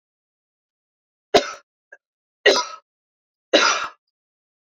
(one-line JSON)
{"three_cough_length": "4.7 s", "three_cough_amplitude": 29144, "three_cough_signal_mean_std_ratio": 0.27, "survey_phase": "alpha (2021-03-01 to 2021-08-12)", "age": "45-64", "gender": "Female", "wearing_mask": "No", "symptom_cough_any": true, "symptom_fatigue": true, "smoker_status": "Ex-smoker", "respiratory_condition_asthma": false, "respiratory_condition_other": false, "recruitment_source": "Test and Trace", "submission_delay": "2 days", "covid_test_result": "Positive", "covid_test_method": "RT-qPCR", "covid_ct_value": 16.4, "covid_ct_gene": "ORF1ab gene", "covid_ct_mean": 18.0, "covid_viral_load": "1200000 copies/ml", "covid_viral_load_category": "High viral load (>1M copies/ml)"}